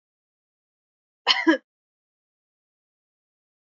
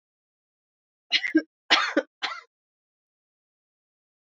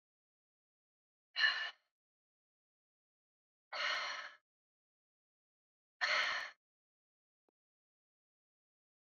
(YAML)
cough_length: 3.7 s
cough_amplitude: 20724
cough_signal_mean_std_ratio: 0.19
three_cough_length: 4.3 s
three_cough_amplitude: 20665
three_cough_signal_mean_std_ratio: 0.27
exhalation_length: 9.0 s
exhalation_amplitude: 3402
exhalation_signal_mean_std_ratio: 0.28
survey_phase: beta (2021-08-13 to 2022-03-07)
age: 18-44
gender: Female
wearing_mask: 'No'
symptom_none: true
smoker_status: Never smoked
respiratory_condition_asthma: false
respiratory_condition_other: false
recruitment_source: REACT
submission_delay: 1 day
covid_test_result: Negative
covid_test_method: RT-qPCR
influenza_a_test_result: Negative
influenza_b_test_result: Negative